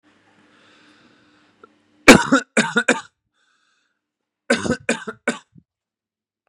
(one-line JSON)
{"three_cough_length": "6.5 s", "three_cough_amplitude": 32768, "three_cough_signal_mean_std_ratio": 0.25, "survey_phase": "beta (2021-08-13 to 2022-03-07)", "age": "18-44", "gender": "Male", "wearing_mask": "No", "symptom_none": true, "smoker_status": "Ex-smoker", "respiratory_condition_asthma": false, "respiratory_condition_other": false, "recruitment_source": "REACT", "submission_delay": "3 days", "covid_test_result": "Negative", "covid_test_method": "RT-qPCR", "influenza_a_test_result": "Negative", "influenza_b_test_result": "Negative"}